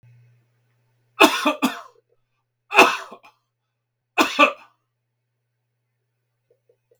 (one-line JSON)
{"three_cough_length": "7.0 s", "three_cough_amplitude": 32768, "three_cough_signal_mean_std_ratio": 0.26, "survey_phase": "beta (2021-08-13 to 2022-03-07)", "age": "65+", "gender": "Male", "wearing_mask": "No", "symptom_none": true, "smoker_status": "Never smoked", "respiratory_condition_asthma": false, "respiratory_condition_other": false, "recruitment_source": "REACT", "submission_delay": "1 day", "covid_test_result": "Negative", "covid_test_method": "RT-qPCR", "influenza_a_test_result": "Negative", "influenza_b_test_result": "Negative"}